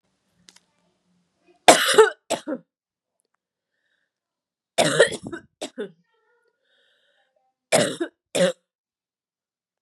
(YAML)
three_cough_length: 9.8 s
three_cough_amplitude: 32768
three_cough_signal_mean_std_ratio: 0.26
survey_phase: beta (2021-08-13 to 2022-03-07)
age: 18-44
gender: Female
wearing_mask: 'No'
symptom_cough_any: true
symptom_runny_or_blocked_nose: true
symptom_fatigue: true
symptom_headache: true
symptom_onset: 3 days
smoker_status: Never smoked
respiratory_condition_asthma: false
respiratory_condition_other: false
recruitment_source: Test and Trace
submission_delay: 2 days
covid_test_result: Positive
covid_test_method: ePCR